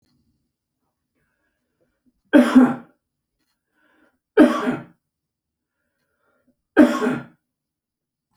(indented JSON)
{
  "three_cough_length": "8.4 s",
  "three_cough_amplitude": 28391,
  "three_cough_signal_mean_std_ratio": 0.26,
  "survey_phase": "beta (2021-08-13 to 2022-03-07)",
  "age": "45-64",
  "gender": "Male",
  "wearing_mask": "No",
  "symptom_none": true,
  "smoker_status": "Ex-smoker",
  "respiratory_condition_asthma": false,
  "respiratory_condition_other": false,
  "recruitment_source": "REACT",
  "submission_delay": "3 days",
  "covid_test_result": "Negative",
  "covid_test_method": "RT-qPCR"
}